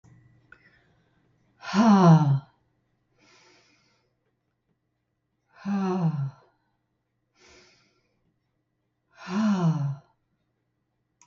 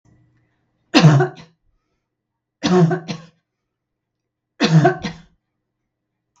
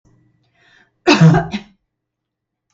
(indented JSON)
{
  "exhalation_length": "11.3 s",
  "exhalation_amplitude": 17041,
  "exhalation_signal_mean_std_ratio": 0.33,
  "three_cough_length": "6.4 s",
  "three_cough_amplitude": 32768,
  "three_cough_signal_mean_std_ratio": 0.34,
  "cough_length": "2.7 s",
  "cough_amplitude": 32768,
  "cough_signal_mean_std_ratio": 0.31,
  "survey_phase": "beta (2021-08-13 to 2022-03-07)",
  "age": "65+",
  "gender": "Female",
  "wearing_mask": "No",
  "symptom_none": true,
  "smoker_status": "Never smoked",
  "respiratory_condition_asthma": false,
  "respiratory_condition_other": false,
  "recruitment_source": "REACT",
  "submission_delay": "1 day",
  "covid_test_result": "Negative",
  "covid_test_method": "RT-qPCR",
  "influenza_a_test_result": "Negative",
  "influenza_b_test_result": "Negative"
}